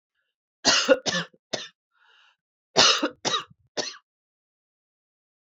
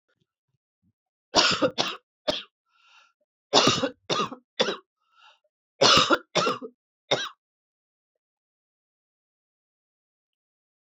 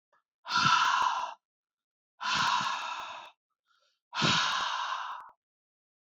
{"cough_length": "5.5 s", "cough_amplitude": 24835, "cough_signal_mean_std_ratio": 0.33, "three_cough_length": "10.8 s", "three_cough_amplitude": 22993, "three_cough_signal_mean_std_ratio": 0.32, "exhalation_length": "6.1 s", "exhalation_amplitude": 7181, "exhalation_signal_mean_std_ratio": 0.56, "survey_phase": "alpha (2021-03-01 to 2021-08-12)", "age": "18-44", "gender": "Female", "wearing_mask": "No", "symptom_cough_any": true, "symptom_fatigue": true, "symptom_fever_high_temperature": true, "symptom_headache": true, "symptom_change_to_sense_of_smell_or_taste": true, "symptom_loss_of_taste": true, "symptom_onset": "3 days", "smoker_status": "Never smoked", "respiratory_condition_asthma": false, "respiratory_condition_other": false, "recruitment_source": "Test and Trace", "submission_delay": "2 days", "covid_test_result": "Positive", "covid_test_method": "RT-qPCR", "covid_ct_value": 18.2, "covid_ct_gene": "ORF1ab gene", "covid_ct_mean": 18.4, "covid_viral_load": "910000 copies/ml", "covid_viral_load_category": "Low viral load (10K-1M copies/ml)"}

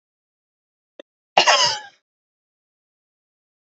{"cough_length": "3.7 s", "cough_amplitude": 28154, "cough_signal_mean_std_ratio": 0.24, "survey_phase": "beta (2021-08-13 to 2022-03-07)", "age": "18-44", "gender": "Female", "wearing_mask": "No", "symptom_none": true, "smoker_status": "Ex-smoker", "respiratory_condition_asthma": false, "respiratory_condition_other": false, "recruitment_source": "REACT", "submission_delay": "0 days", "covid_test_result": "Negative", "covid_test_method": "RT-qPCR", "influenza_a_test_result": "Negative", "influenza_b_test_result": "Negative"}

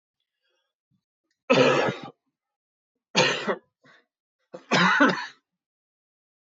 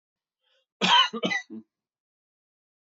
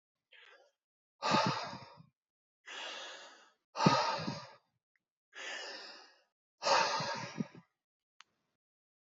{"three_cough_length": "6.5 s", "three_cough_amplitude": 21040, "three_cough_signal_mean_std_ratio": 0.36, "cough_length": "3.0 s", "cough_amplitude": 14880, "cough_signal_mean_std_ratio": 0.31, "exhalation_length": "9.0 s", "exhalation_amplitude": 9497, "exhalation_signal_mean_std_ratio": 0.39, "survey_phase": "beta (2021-08-13 to 2022-03-07)", "age": "18-44", "gender": "Male", "wearing_mask": "No", "symptom_cough_any": true, "symptom_runny_or_blocked_nose": true, "symptom_fatigue": true, "smoker_status": "Never smoked", "respiratory_condition_asthma": false, "respiratory_condition_other": false, "recruitment_source": "Test and Trace", "submission_delay": "2 days", "covid_test_result": "Positive", "covid_test_method": "RT-qPCR", "covid_ct_value": 14.8, "covid_ct_gene": "S gene", "covid_ct_mean": 15.2, "covid_viral_load": "10000000 copies/ml", "covid_viral_load_category": "High viral load (>1M copies/ml)"}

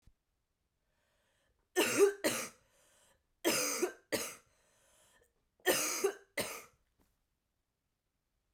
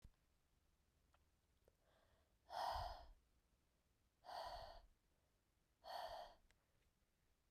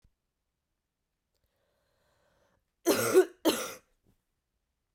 {"three_cough_length": "8.5 s", "three_cough_amplitude": 5093, "three_cough_signal_mean_std_ratio": 0.35, "exhalation_length": "7.5 s", "exhalation_amplitude": 528, "exhalation_signal_mean_std_ratio": 0.4, "cough_length": "4.9 s", "cough_amplitude": 8237, "cough_signal_mean_std_ratio": 0.25, "survey_phase": "beta (2021-08-13 to 2022-03-07)", "age": "18-44", "gender": "Female", "wearing_mask": "No", "symptom_cough_any": true, "symptom_new_continuous_cough": true, "symptom_runny_or_blocked_nose": true, "symptom_sore_throat": true, "symptom_fatigue": true, "symptom_fever_high_temperature": true, "symptom_headache": true, "symptom_change_to_sense_of_smell_or_taste": true, "symptom_onset": "10 days", "smoker_status": "Never smoked", "respiratory_condition_asthma": false, "respiratory_condition_other": false, "recruitment_source": "Test and Trace", "submission_delay": "2 days", "covid_test_result": "Positive", "covid_test_method": "RT-qPCR", "covid_ct_value": 19.1, "covid_ct_gene": "N gene"}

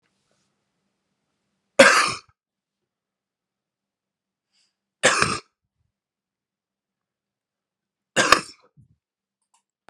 {"three_cough_length": "9.9 s", "three_cough_amplitude": 32768, "three_cough_signal_mean_std_ratio": 0.2, "survey_phase": "beta (2021-08-13 to 2022-03-07)", "age": "45-64", "gender": "Male", "wearing_mask": "No", "symptom_headache": true, "symptom_onset": "5 days", "smoker_status": "Ex-smoker", "respiratory_condition_asthma": false, "respiratory_condition_other": false, "recruitment_source": "Test and Trace", "submission_delay": "1 day", "covid_test_result": "Positive", "covid_test_method": "RT-qPCR"}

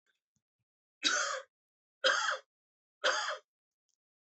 {"three_cough_length": "4.4 s", "three_cough_amplitude": 6785, "three_cough_signal_mean_std_ratio": 0.38, "survey_phase": "alpha (2021-03-01 to 2021-08-12)", "age": "45-64", "gender": "Male", "wearing_mask": "No", "symptom_none": true, "smoker_status": "Ex-smoker", "respiratory_condition_asthma": false, "respiratory_condition_other": false, "recruitment_source": "REACT", "submission_delay": "2 days", "covid_test_result": "Negative", "covid_test_method": "RT-qPCR"}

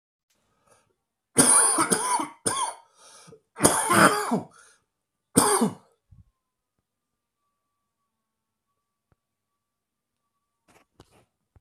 {"three_cough_length": "11.6 s", "three_cough_amplitude": 29274, "three_cough_signal_mean_std_ratio": 0.33, "survey_phase": "beta (2021-08-13 to 2022-03-07)", "age": "18-44", "gender": "Male", "wearing_mask": "No", "symptom_cough_any": true, "symptom_headache": true, "symptom_change_to_sense_of_smell_or_taste": true, "symptom_onset": "5 days", "smoker_status": "Ex-smoker", "respiratory_condition_asthma": false, "respiratory_condition_other": false, "recruitment_source": "Test and Trace", "submission_delay": "2 days", "covid_test_result": "Positive", "covid_test_method": "ePCR"}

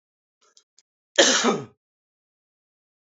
{"cough_length": "3.1 s", "cough_amplitude": 27026, "cough_signal_mean_std_ratio": 0.28, "survey_phase": "beta (2021-08-13 to 2022-03-07)", "age": "18-44", "gender": "Male", "wearing_mask": "No", "symptom_cough_any": true, "symptom_runny_or_blocked_nose": true, "symptom_sore_throat": true, "symptom_fatigue": true, "symptom_headache": true, "symptom_onset": "9 days", "smoker_status": "Never smoked", "respiratory_condition_asthma": false, "respiratory_condition_other": false, "recruitment_source": "Test and Trace", "submission_delay": "1 day", "covid_test_result": "Positive", "covid_test_method": "RT-qPCR", "covid_ct_value": 24.3, "covid_ct_gene": "ORF1ab gene", "covid_ct_mean": 24.7, "covid_viral_load": "7900 copies/ml", "covid_viral_load_category": "Minimal viral load (< 10K copies/ml)"}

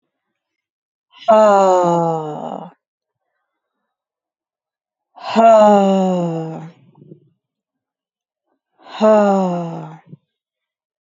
{"exhalation_length": "11.0 s", "exhalation_amplitude": 28226, "exhalation_signal_mean_std_ratio": 0.42, "survey_phase": "beta (2021-08-13 to 2022-03-07)", "age": "18-44", "gender": "Female", "wearing_mask": "No", "symptom_cough_any": true, "symptom_shortness_of_breath": true, "symptom_change_to_sense_of_smell_or_taste": true, "smoker_status": "Never smoked", "respiratory_condition_asthma": false, "respiratory_condition_other": false, "recruitment_source": "REACT", "submission_delay": "1 day", "covid_test_result": "Negative", "covid_test_method": "RT-qPCR", "influenza_a_test_result": "Negative", "influenza_b_test_result": "Negative"}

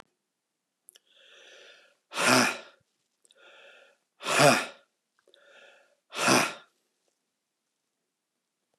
{"exhalation_length": "8.8 s", "exhalation_amplitude": 16461, "exhalation_signal_mean_std_ratio": 0.28, "survey_phase": "beta (2021-08-13 to 2022-03-07)", "age": "65+", "gender": "Male", "wearing_mask": "No", "symptom_none": true, "smoker_status": "Ex-smoker", "respiratory_condition_asthma": false, "respiratory_condition_other": false, "recruitment_source": "REACT", "submission_delay": "1 day", "covid_test_result": "Negative", "covid_test_method": "RT-qPCR", "influenza_a_test_result": "Negative", "influenza_b_test_result": "Negative"}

